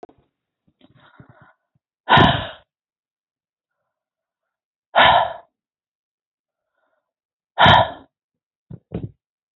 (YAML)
exhalation_length: 9.6 s
exhalation_amplitude: 28759
exhalation_signal_mean_std_ratio: 0.26
survey_phase: beta (2021-08-13 to 2022-03-07)
age: 45-64
gender: Female
wearing_mask: 'No'
symptom_none: true
smoker_status: Never smoked
respiratory_condition_asthma: false
respiratory_condition_other: false
recruitment_source: REACT
submission_delay: 2 days
covid_test_result: Negative
covid_test_method: RT-qPCR
influenza_a_test_result: Negative
influenza_b_test_result: Negative